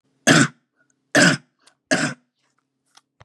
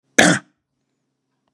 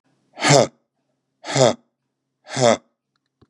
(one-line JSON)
{"three_cough_length": "3.2 s", "three_cough_amplitude": 29691, "three_cough_signal_mean_std_ratio": 0.34, "cough_length": "1.5 s", "cough_amplitude": 32768, "cough_signal_mean_std_ratio": 0.27, "exhalation_length": "3.5 s", "exhalation_amplitude": 31833, "exhalation_signal_mean_std_ratio": 0.33, "survey_phase": "beta (2021-08-13 to 2022-03-07)", "age": "65+", "gender": "Male", "wearing_mask": "No", "symptom_none": true, "smoker_status": "Never smoked", "respiratory_condition_asthma": false, "respiratory_condition_other": false, "recruitment_source": "REACT", "submission_delay": "1 day", "covid_test_result": "Negative", "covid_test_method": "RT-qPCR"}